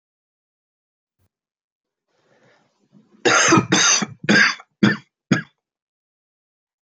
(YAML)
cough_length: 6.8 s
cough_amplitude: 24941
cough_signal_mean_std_ratio: 0.34
survey_phase: beta (2021-08-13 to 2022-03-07)
age: 65+
gender: Male
wearing_mask: 'No'
symptom_cough_any: true
symptom_shortness_of_breath: true
symptom_fatigue: true
symptom_change_to_sense_of_smell_or_taste: true
symptom_other: true
symptom_onset: 4 days
smoker_status: Never smoked
respiratory_condition_asthma: true
respiratory_condition_other: false
recruitment_source: Test and Trace
submission_delay: 1 day
covid_test_result: Positive
covid_test_method: RT-qPCR
covid_ct_value: 16.3
covid_ct_gene: ORF1ab gene
covid_ct_mean: 16.4
covid_viral_load: 4000000 copies/ml
covid_viral_load_category: High viral load (>1M copies/ml)